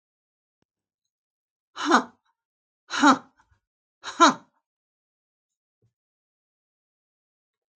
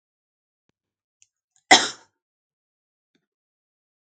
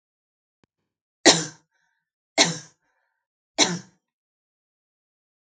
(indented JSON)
{
  "exhalation_length": "7.8 s",
  "exhalation_amplitude": 21995,
  "exhalation_signal_mean_std_ratio": 0.2,
  "cough_length": "4.0 s",
  "cough_amplitude": 32767,
  "cough_signal_mean_std_ratio": 0.13,
  "three_cough_length": "5.5 s",
  "three_cough_amplitude": 32768,
  "three_cough_signal_mean_std_ratio": 0.21,
  "survey_phase": "beta (2021-08-13 to 2022-03-07)",
  "age": "65+",
  "gender": "Female",
  "wearing_mask": "No",
  "symptom_headache": true,
  "symptom_onset": "2 days",
  "smoker_status": "Never smoked",
  "respiratory_condition_asthma": false,
  "respiratory_condition_other": false,
  "recruitment_source": "Test and Trace",
  "submission_delay": "1 day",
  "covid_test_result": "Negative",
  "covid_test_method": "ePCR"
}